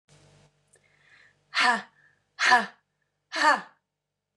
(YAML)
exhalation_length: 4.4 s
exhalation_amplitude: 16449
exhalation_signal_mean_std_ratio: 0.33
survey_phase: beta (2021-08-13 to 2022-03-07)
age: 45-64
gender: Female
wearing_mask: 'No'
symptom_cough_any: true
symptom_runny_or_blocked_nose: true
symptom_fatigue: true
symptom_onset: 5 days
smoker_status: Ex-smoker
respiratory_condition_asthma: false
respiratory_condition_other: false
recruitment_source: Test and Trace
submission_delay: 3 days
covid_test_result: Positive
covid_test_method: RT-qPCR
covid_ct_value: 14.6
covid_ct_gene: ORF1ab gene
covid_ct_mean: 14.8
covid_viral_load: 14000000 copies/ml
covid_viral_load_category: High viral load (>1M copies/ml)